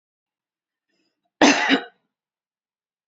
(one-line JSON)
{"cough_length": "3.1 s", "cough_amplitude": 29246, "cough_signal_mean_std_ratio": 0.26, "survey_phase": "beta (2021-08-13 to 2022-03-07)", "age": "45-64", "gender": "Female", "wearing_mask": "No", "symptom_none": true, "smoker_status": "Ex-smoker", "respiratory_condition_asthma": false, "respiratory_condition_other": false, "recruitment_source": "REACT", "submission_delay": "2 days", "covid_test_result": "Negative", "covid_test_method": "RT-qPCR", "influenza_a_test_result": "Negative", "influenza_b_test_result": "Negative"}